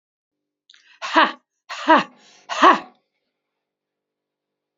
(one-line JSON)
{"exhalation_length": "4.8 s", "exhalation_amplitude": 28435, "exhalation_signal_mean_std_ratio": 0.27, "survey_phase": "alpha (2021-03-01 to 2021-08-12)", "age": "45-64", "gender": "Female", "wearing_mask": "No", "symptom_none": true, "smoker_status": "Ex-smoker", "respiratory_condition_asthma": false, "respiratory_condition_other": false, "recruitment_source": "REACT", "submission_delay": "1 day", "covid_test_result": "Negative", "covid_test_method": "RT-qPCR"}